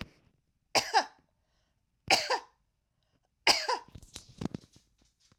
{"three_cough_length": "5.4 s", "three_cough_amplitude": 14380, "three_cough_signal_mean_std_ratio": 0.29, "survey_phase": "alpha (2021-03-01 to 2021-08-12)", "age": "65+", "gender": "Female", "wearing_mask": "No", "symptom_none": true, "smoker_status": "Never smoked", "respiratory_condition_asthma": true, "respiratory_condition_other": false, "recruitment_source": "REACT", "submission_delay": "2 days", "covid_test_result": "Negative", "covid_test_method": "RT-qPCR"}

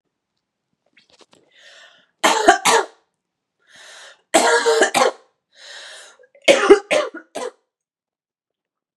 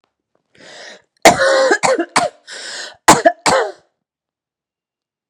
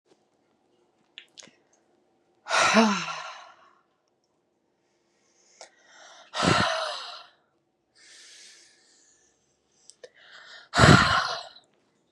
{"three_cough_length": "9.0 s", "three_cough_amplitude": 32768, "three_cough_signal_mean_std_ratio": 0.35, "cough_length": "5.3 s", "cough_amplitude": 32768, "cough_signal_mean_std_ratio": 0.4, "exhalation_length": "12.1 s", "exhalation_amplitude": 28318, "exhalation_signal_mean_std_ratio": 0.3, "survey_phase": "beta (2021-08-13 to 2022-03-07)", "age": "18-44", "gender": "Female", "wearing_mask": "No", "symptom_cough_any": true, "symptom_runny_or_blocked_nose": true, "symptom_fatigue": true, "symptom_headache": true, "symptom_onset": "3 days", "smoker_status": "Never smoked", "respiratory_condition_asthma": false, "respiratory_condition_other": false, "recruitment_source": "Test and Trace", "submission_delay": "2 days", "covid_test_result": "Positive", "covid_test_method": "RT-qPCR"}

